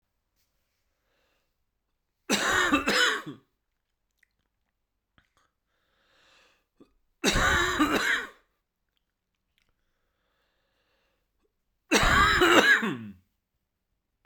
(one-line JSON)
{"three_cough_length": "14.3 s", "three_cough_amplitude": 16514, "three_cough_signal_mean_std_ratio": 0.36, "survey_phase": "beta (2021-08-13 to 2022-03-07)", "age": "18-44", "gender": "Male", "wearing_mask": "No", "symptom_cough_any": true, "symptom_runny_or_blocked_nose": true, "symptom_fatigue": true, "symptom_fever_high_temperature": true, "symptom_change_to_sense_of_smell_or_taste": true, "symptom_loss_of_taste": true, "symptom_onset": "3 days", "smoker_status": "Never smoked", "respiratory_condition_asthma": true, "respiratory_condition_other": false, "recruitment_source": "Test and Trace", "submission_delay": "2 days", "covid_test_result": "Positive", "covid_test_method": "RT-qPCR", "covid_ct_value": 14.8, "covid_ct_gene": "N gene", "covid_ct_mean": 15.9, "covid_viral_load": "6200000 copies/ml", "covid_viral_load_category": "High viral load (>1M copies/ml)"}